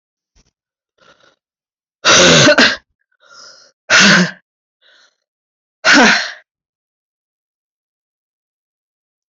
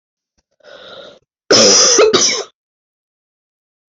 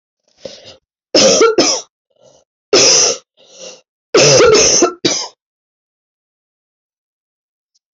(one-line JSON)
{"exhalation_length": "9.3 s", "exhalation_amplitude": 32768, "exhalation_signal_mean_std_ratio": 0.35, "cough_length": "3.9 s", "cough_amplitude": 31996, "cough_signal_mean_std_ratio": 0.42, "three_cough_length": "7.9 s", "three_cough_amplitude": 32767, "three_cough_signal_mean_std_ratio": 0.44, "survey_phase": "beta (2021-08-13 to 2022-03-07)", "age": "18-44", "gender": "Female", "wearing_mask": "No", "symptom_cough_any": true, "symptom_new_continuous_cough": true, "symptom_runny_or_blocked_nose": true, "symptom_shortness_of_breath": true, "symptom_fatigue": true, "symptom_other": true, "smoker_status": "Never smoked", "respiratory_condition_asthma": false, "respiratory_condition_other": false, "recruitment_source": "Test and Trace", "submission_delay": "2 days", "covid_test_result": "Positive", "covid_test_method": "LFT"}